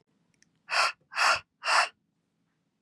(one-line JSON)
{"exhalation_length": "2.8 s", "exhalation_amplitude": 11902, "exhalation_signal_mean_std_ratio": 0.39, "survey_phase": "beta (2021-08-13 to 2022-03-07)", "age": "18-44", "gender": "Female", "wearing_mask": "No", "symptom_none": true, "smoker_status": "Prefer not to say", "respiratory_condition_asthma": false, "respiratory_condition_other": false, "recruitment_source": "REACT", "submission_delay": "3 days", "covid_test_result": "Negative", "covid_test_method": "RT-qPCR", "influenza_a_test_result": "Negative", "influenza_b_test_result": "Negative"}